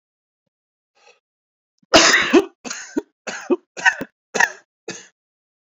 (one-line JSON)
{"cough_length": "5.7 s", "cough_amplitude": 32362, "cough_signal_mean_std_ratio": 0.32, "survey_phase": "beta (2021-08-13 to 2022-03-07)", "age": "45-64", "gender": "Male", "wearing_mask": "No", "symptom_cough_any": true, "symptom_runny_or_blocked_nose": true, "symptom_fatigue": true, "symptom_fever_high_temperature": true, "symptom_headache": true, "symptom_onset": "3 days", "smoker_status": "Never smoked", "respiratory_condition_asthma": false, "respiratory_condition_other": false, "recruitment_source": "Test and Trace", "submission_delay": "2 days", "covid_test_result": "Positive", "covid_test_method": "RT-qPCR"}